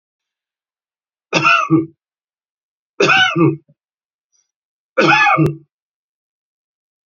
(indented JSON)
{
  "three_cough_length": "7.1 s",
  "three_cough_amplitude": 32647,
  "three_cough_signal_mean_std_ratio": 0.39,
  "survey_phase": "beta (2021-08-13 to 2022-03-07)",
  "age": "45-64",
  "gender": "Male",
  "wearing_mask": "No",
  "symptom_none": true,
  "smoker_status": "Ex-smoker",
  "respiratory_condition_asthma": true,
  "respiratory_condition_other": true,
  "recruitment_source": "REACT",
  "submission_delay": "2 days",
  "covid_test_result": "Negative",
  "covid_test_method": "RT-qPCR",
  "influenza_a_test_result": "Negative",
  "influenza_b_test_result": "Negative"
}